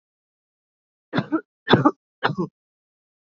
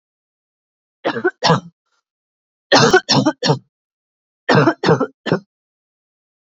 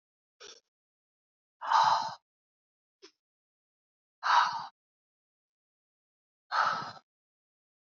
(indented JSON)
{
  "three_cough_length": "3.2 s",
  "three_cough_amplitude": 27444,
  "three_cough_signal_mean_std_ratio": 0.29,
  "cough_length": "6.6 s",
  "cough_amplitude": 29401,
  "cough_signal_mean_std_ratio": 0.39,
  "exhalation_length": "7.9 s",
  "exhalation_amplitude": 7704,
  "exhalation_signal_mean_std_ratio": 0.3,
  "survey_phase": "beta (2021-08-13 to 2022-03-07)",
  "age": "18-44",
  "gender": "Female",
  "wearing_mask": "No",
  "symptom_cough_any": true,
  "symptom_runny_or_blocked_nose": true,
  "symptom_shortness_of_breath": true,
  "symptom_diarrhoea": true,
  "symptom_fatigue": true,
  "smoker_status": "Never smoked",
  "respiratory_condition_asthma": false,
  "respiratory_condition_other": false,
  "recruitment_source": "Test and Trace",
  "submission_delay": "1 day",
  "covid_test_result": "Positive",
  "covid_test_method": "LFT"
}